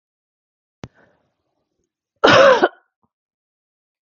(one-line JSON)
{"cough_length": "4.0 s", "cough_amplitude": 32766, "cough_signal_mean_std_ratio": 0.26, "survey_phase": "beta (2021-08-13 to 2022-03-07)", "age": "45-64", "gender": "Female", "wearing_mask": "No", "symptom_cough_any": true, "symptom_new_continuous_cough": true, "symptom_fatigue": true, "symptom_change_to_sense_of_smell_or_taste": true, "symptom_other": true, "symptom_onset": "9 days", "smoker_status": "Ex-smoker", "respiratory_condition_asthma": false, "respiratory_condition_other": false, "recruitment_source": "REACT", "submission_delay": "1 day", "covid_test_result": "Positive", "covid_test_method": "RT-qPCR", "covid_ct_value": 30.0, "covid_ct_gene": "E gene", "influenza_a_test_result": "Negative", "influenza_b_test_result": "Negative"}